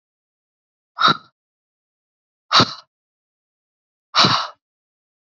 {"exhalation_length": "5.2 s", "exhalation_amplitude": 31096, "exhalation_signal_mean_std_ratio": 0.26, "survey_phase": "beta (2021-08-13 to 2022-03-07)", "age": "18-44", "gender": "Female", "wearing_mask": "No", "symptom_cough_any": true, "symptom_runny_or_blocked_nose": true, "symptom_fatigue": true, "symptom_fever_high_temperature": true, "symptom_headache": true, "smoker_status": "Never smoked", "respiratory_condition_asthma": false, "respiratory_condition_other": false, "recruitment_source": "Test and Trace", "submission_delay": "1 day", "covid_test_result": "Positive", "covid_test_method": "RT-qPCR"}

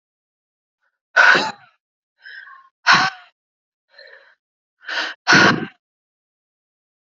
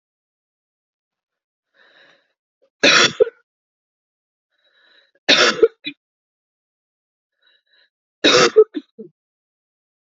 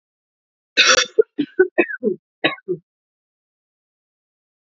{"exhalation_length": "7.1 s", "exhalation_amplitude": 31214, "exhalation_signal_mean_std_ratio": 0.31, "three_cough_length": "10.1 s", "three_cough_amplitude": 31623, "three_cough_signal_mean_std_ratio": 0.25, "cough_length": "4.8 s", "cough_amplitude": 32445, "cough_signal_mean_std_ratio": 0.31, "survey_phase": "alpha (2021-03-01 to 2021-08-12)", "age": "18-44", "gender": "Female", "wearing_mask": "No", "symptom_shortness_of_breath": true, "symptom_loss_of_taste": true, "smoker_status": "Never smoked", "respiratory_condition_asthma": false, "respiratory_condition_other": false, "recruitment_source": "Test and Trace", "submission_delay": "0 days", "covid_test_result": "Positive", "covid_test_method": "RT-qPCR", "covid_ct_value": 21.9, "covid_ct_gene": "ORF1ab gene", "covid_ct_mean": 22.3, "covid_viral_load": "49000 copies/ml", "covid_viral_load_category": "Low viral load (10K-1M copies/ml)"}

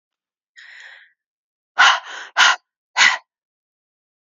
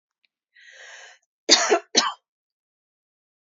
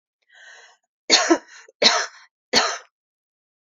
{"exhalation_length": "4.3 s", "exhalation_amplitude": 32767, "exhalation_signal_mean_std_ratio": 0.31, "cough_length": "3.4 s", "cough_amplitude": 31143, "cough_signal_mean_std_ratio": 0.28, "three_cough_length": "3.8 s", "three_cough_amplitude": 29946, "three_cough_signal_mean_std_ratio": 0.34, "survey_phase": "beta (2021-08-13 to 2022-03-07)", "age": "45-64", "gender": "Female", "wearing_mask": "No", "symptom_none": true, "smoker_status": "Never smoked", "respiratory_condition_asthma": false, "respiratory_condition_other": false, "recruitment_source": "REACT", "submission_delay": "2 days", "covid_test_result": "Negative", "covid_test_method": "RT-qPCR", "influenza_a_test_result": "Negative", "influenza_b_test_result": "Negative"}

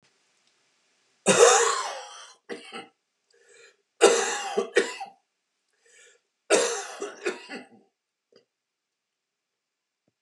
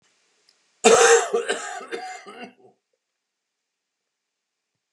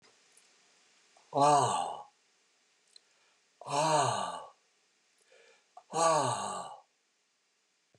{"three_cough_length": "10.2 s", "three_cough_amplitude": 22843, "three_cough_signal_mean_std_ratio": 0.32, "cough_length": "4.9 s", "cough_amplitude": 29564, "cough_signal_mean_std_ratio": 0.31, "exhalation_length": "8.0 s", "exhalation_amplitude": 6782, "exhalation_signal_mean_std_ratio": 0.4, "survey_phase": "beta (2021-08-13 to 2022-03-07)", "age": "65+", "gender": "Male", "wearing_mask": "No", "symptom_cough_any": true, "symptom_new_continuous_cough": true, "symptom_runny_or_blocked_nose": true, "symptom_fatigue": true, "symptom_fever_high_temperature": true, "symptom_headache": true, "symptom_change_to_sense_of_smell_or_taste": true, "symptom_loss_of_taste": true, "symptom_onset": "6 days", "smoker_status": "Never smoked", "respiratory_condition_asthma": false, "respiratory_condition_other": false, "recruitment_source": "REACT", "submission_delay": "1 day", "covid_test_result": "Positive", "covid_test_method": "RT-qPCR", "covid_ct_value": 15.0, "covid_ct_gene": "E gene"}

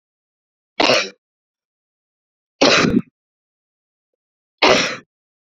{"three_cough_length": "5.5 s", "three_cough_amplitude": 32768, "three_cough_signal_mean_std_ratio": 0.32, "survey_phase": "beta (2021-08-13 to 2022-03-07)", "age": "18-44", "gender": "Female", "wearing_mask": "No", "symptom_cough_any": true, "symptom_runny_or_blocked_nose": true, "symptom_fatigue": true, "symptom_headache": true, "symptom_loss_of_taste": true, "symptom_onset": "4 days", "smoker_status": "Ex-smoker", "respiratory_condition_asthma": false, "respiratory_condition_other": false, "recruitment_source": "Test and Trace", "submission_delay": "2 days", "covid_test_result": "Positive", "covid_test_method": "RT-qPCR", "covid_ct_value": 19.4, "covid_ct_gene": "ORF1ab gene"}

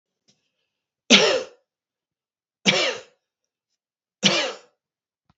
{"three_cough_length": "5.4 s", "three_cough_amplitude": 32437, "three_cough_signal_mean_std_ratio": 0.3, "survey_phase": "beta (2021-08-13 to 2022-03-07)", "age": "65+", "gender": "Male", "wearing_mask": "No", "symptom_none": true, "smoker_status": "Never smoked", "respiratory_condition_asthma": false, "respiratory_condition_other": false, "recruitment_source": "REACT", "submission_delay": "2 days", "covid_test_result": "Negative", "covid_test_method": "RT-qPCR"}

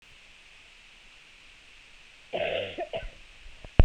{"cough_length": "3.8 s", "cough_amplitude": 26882, "cough_signal_mean_std_ratio": 0.26, "survey_phase": "beta (2021-08-13 to 2022-03-07)", "age": "18-44", "gender": "Female", "wearing_mask": "No", "symptom_cough_any": true, "symptom_runny_or_blocked_nose": true, "symptom_fatigue": true, "symptom_headache": true, "symptom_change_to_sense_of_smell_or_taste": true, "symptom_onset": "12 days", "smoker_status": "Never smoked", "respiratory_condition_asthma": false, "respiratory_condition_other": false, "recruitment_source": "Test and Trace", "submission_delay": "1 day", "covid_test_result": "Positive", "covid_test_method": "RT-qPCR"}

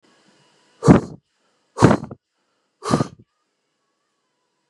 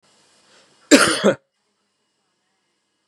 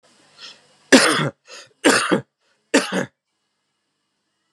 {"exhalation_length": "4.7 s", "exhalation_amplitude": 32768, "exhalation_signal_mean_std_ratio": 0.24, "cough_length": "3.1 s", "cough_amplitude": 32768, "cough_signal_mean_std_ratio": 0.26, "three_cough_length": "4.5 s", "three_cough_amplitude": 32768, "three_cough_signal_mean_std_ratio": 0.34, "survey_phase": "beta (2021-08-13 to 2022-03-07)", "age": "45-64", "gender": "Male", "wearing_mask": "Yes", "symptom_fever_high_temperature": true, "symptom_headache": true, "symptom_change_to_sense_of_smell_or_taste": true, "symptom_loss_of_taste": true, "symptom_onset": "3 days", "smoker_status": "Ex-smoker", "respiratory_condition_asthma": false, "respiratory_condition_other": false, "recruitment_source": "Test and Trace", "submission_delay": "2 days", "covid_test_result": "Positive", "covid_test_method": "RT-qPCR"}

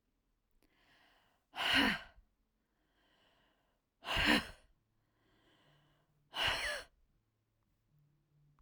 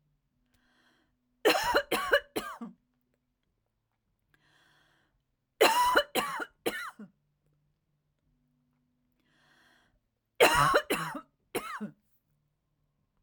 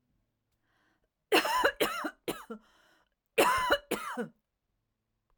{"exhalation_length": "8.6 s", "exhalation_amplitude": 4713, "exhalation_signal_mean_std_ratio": 0.3, "three_cough_length": "13.2 s", "three_cough_amplitude": 14680, "three_cough_signal_mean_std_ratio": 0.32, "cough_length": "5.4 s", "cough_amplitude": 10097, "cough_signal_mean_std_ratio": 0.4, "survey_phase": "alpha (2021-03-01 to 2021-08-12)", "age": "45-64", "gender": "Female", "wearing_mask": "No", "symptom_none": true, "smoker_status": "Ex-smoker", "respiratory_condition_asthma": false, "respiratory_condition_other": false, "recruitment_source": "REACT", "submission_delay": "3 days", "covid_test_result": "Negative", "covid_test_method": "RT-qPCR"}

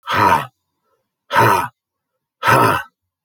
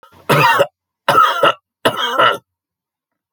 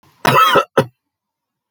{"exhalation_length": "3.2 s", "exhalation_amplitude": 28927, "exhalation_signal_mean_std_ratio": 0.48, "three_cough_length": "3.3 s", "three_cough_amplitude": 31251, "three_cough_signal_mean_std_ratio": 0.52, "cough_length": "1.7 s", "cough_amplitude": 31122, "cough_signal_mean_std_ratio": 0.44, "survey_phase": "alpha (2021-03-01 to 2021-08-12)", "age": "65+", "gender": "Male", "wearing_mask": "No", "symptom_none": true, "smoker_status": "Ex-smoker", "respiratory_condition_asthma": false, "respiratory_condition_other": false, "recruitment_source": "REACT", "submission_delay": "2 days", "covid_test_result": "Negative", "covid_test_method": "RT-qPCR"}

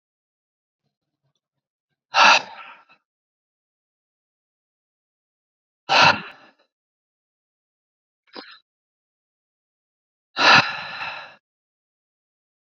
{"exhalation_length": "12.7 s", "exhalation_amplitude": 30981, "exhalation_signal_mean_std_ratio": 0.22, "survey_phase": "beta (2021-08-13 to 2022-03-07)", "age": "18-44", "gender": "Male", "wearing_mask": "No", "symptom_cough_any": true, "symptom_runny_or_blocked_nose": true, "symptom_shortness_of_breath": true, "symptom_change_to_sense_of_smell_or_taste": true, "symptom_other": true, "smoker_status": "Never smoked", "respiratory_condition_asthma": false, "respiratory_condition_other": false, "recruitment_source": "Test and Trace", "submission_delay": "1 day", "covid_test_result": "Positive", "covid_test_method": "RT-qPCR", "covid_ct_value": 22.6, "covid_ct_gene": "ORF1ab gene", "covid_ct_mean": 22.8, "covid_viral_load": "33000 copies/ml", "covid_viral_load_category": "Low viral load (10K-1M copies/ml)"}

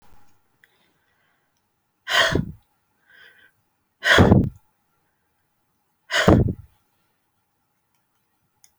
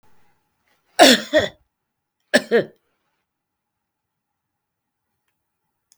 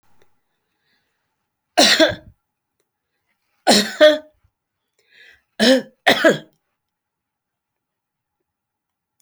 {"exhalation_length": "8.8 s", "exhalation_amplitude": 27255, "exhalation_signal_mean_std_ratio": 0.28, "cough_length": "6.0 s", "cough_amplitude": 32064, "cough_signal_mean_std_ratio": 0.23, "three_cough_length": "9.2 s", "three_cough_amplitude": 31467, "three_cough_signal_mean_std_ratio": 0.28, "survey_phase": "beta (2021-08-13 to 2022-03-07)", "age": "65+", "gender": "Female", "wearing_mask": "No", "symptom_none": true, "smoker_status": "Never smoked", "respiratory_condition_asthma": false, "respiratory_condition_other": false, "recruitment_source": "REACT", "submission_delay": "2 days", "covid_test_result": "Negative", "covid_test_method": "RT-qPCR"}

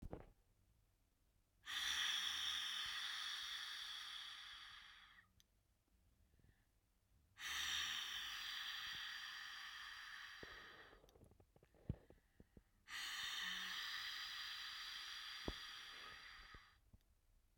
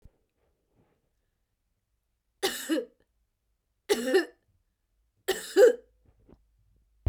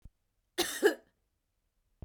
{"exhalation_length": "17.6 s", "exhalation_amplitude": 1370, "exhalation_signal_mean_std_ratio": 0.69, "three_cough_length": "7.1 s", "three_cough_amplitude": 13239, "three_cough_signal_mean_std_ratio": 0.26, "cough_length": "2.0 s", "cough_amplitude": 7789, "cough_signal_mean_std_ratio": 0.27, "survey_phase": "beta (2021-08-13 to 2022-03-07)", "age": "45-64", "gender": "Female", "wearing_mask": "No", "symptom_cough_any": true, "symptom_change_to_sense_of_smell_or_taste": true, "symptom_loss_of_taste": true, "symptom_onset": "8 days", "smoker_status": "Never smoked", "respiratory_condition_asthma": false, "respiratory_condition_other": false, "recruitment_source": "REACT", "submission_delay": "2 days", "covid_test_result": "Positive", "covid_test_method": "RT-qPCR", "covid_ct_value": 20.0, "covid_ct_gene": "E gene", "influenza_a_test_result": "Negative", "influenza_b_test_result": "Negative"}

